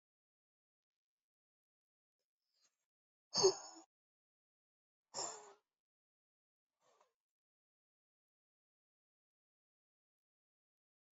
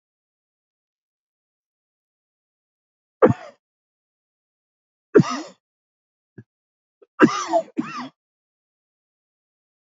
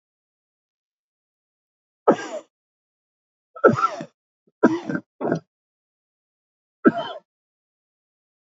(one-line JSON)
{"exhalation_length": "11.2 s", "exhalation_amplitude": 4142, "exhalation_signal_mean_std_ratio": 0.13, "three_cough_length": "9.9 s", "three_cough_amplitude": 29507, "three_cough_signal_mean_std_ratio": 0.19, "cough_length": "8.4 s", "cough_amplitude": 28924, "cough_signal_mean_std_ratio": 0.24, "survey_phase": "alpha (2021-03-01 to 2021-08-12)", "age": "65+", "gender": "Male", "wearing_mask": "No", "symptom_cough_any": true, "symptom_onset": "13 days", "smoker_status": "Ex-smoker", "respiratory_condition_asthma": false, "respiratory_condition_other": true, "recruitment_source": "REACT", "submission_delay": "33 days", "covid_test_result": "Negative", "covid_test_method": "RT-qPCR"}